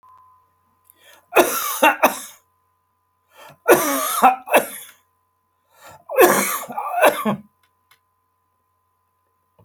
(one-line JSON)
{"three_cough_length": "9.6 s", "three_cough_amplitude": 31341, "three_cough_signal_mean_std_ratio": 0.37, "survey_phase": "alpha (2021-03-01 to 2021-08-12)", "age": "65+", "gender": "Male", "wearing_mask": "No", "symptom_none": true, "smoker_status": "Never smoked", "respiratory_condition_asthma": false, "respiratory_condition_other": false, "recruitment_source": "REACT", "submission_delay": "2 days", "covid_test_result": "Negative", "covid_test_method": "RT-qPCR"}